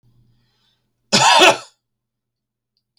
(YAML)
cough_length: 3.0 s
cough_amplitude: 32146
cough_signal_mean_std_ratio: 0.31
survey_phase: beta (2021-08-13 to 2022-03-07)
age: 45-64
gender: Male
wearing_mask: 'No'
symptom_none: true
smoker_status: Never smoked
respiratory_condition_asthma: false
respiratory_condition_other: false
recruitment_source: REACT
submission_delay: 1 day
covid_test_result: Negative
covid_test_method: RT-qPCR